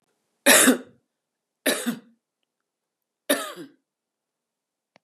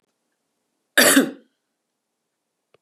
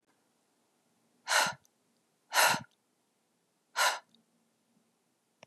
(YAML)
three_cough_length: 5.0 s
three_cough_amplitude: 24950
three_cough_signal_mean_std_ratio: 0.28
cough_length: 2.8 s
cough_amplitude: 30596
cough_signal_mean_std_ratio: 0.26
exhalation_length: 5.5 s
exhalation_amplitude: 8084
exhalation_signal_mean_std_ratio: 0.28
survey_phase: beta (2021-08-13 to 2022-03-07)
age: 45-64
gender: Female
wearing_mask: 'No'
symptom_cough_any: true
smoker_status: Ex-smoker
respiratory_condition_asthma: false
respiratory_condition_other: false
recruitment_source: REACT
submission_delay: 0 days
covid_test_result: Negative
covid_test_method: RT-qPCR
influenza_a_test_result: Unknown/Void
influenza_b_test_result: Unknown/Void